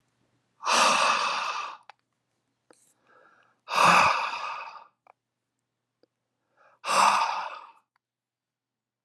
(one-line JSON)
{"exhalation_length": "9.0 s", "exhalation_amplitude": 16384, "exhalation_signal_mean_std_ratio": 0.41, "survey_phase": "alpha (2021-03-01 to 2021-08-12)", "age": "18-44", "gender": "Male", "wearing_mask": "No", "symptom_fatigue": true, "symptom_onset": "3 days", "smoker_status": "Never smoked", "respiratory_condition_asthma": false, "respiratory_condition_other": false, "recruitment_source": "Test and Trace", "submission_delay": "1 day", "covid_test_result": "Positive", "covid_test_method": "RT-qPCR", "covid_ct_value": 13.1, "covid_ct_gene": "N gene", "covid_ct_mean": 13.6, "covid_viral_load": "35000000 copies/ml", "covid_viral_load_category": "High viral load (>1M copies/ml)"}